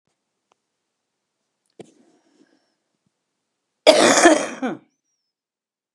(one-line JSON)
{"cough_length": "5.9 s", "cough_amplitude": 32768, "cough_signal_mean_std_ratio": 0.25, "survey_phase": "beta (2021-08-13 to 2022-03-07)", "age": "65+", "gender": "Female", "wearing_mask": "No", "symptom_cough_any": true, "symptom_shortness_of_breath": true, "symptom_onset": "12 days", "smoker_status": "Never smoked", "respiratory_condition_asthma": true, "respiratory_condition_other": false, "recruitment_source": "REACT", "submission_delay": "4 days", "covid_test_result": "Negative", "covid_test_method": "RT-qPCR", "influenza_a_test_result": "Negative", "influenza_b_test_result": "Negative"}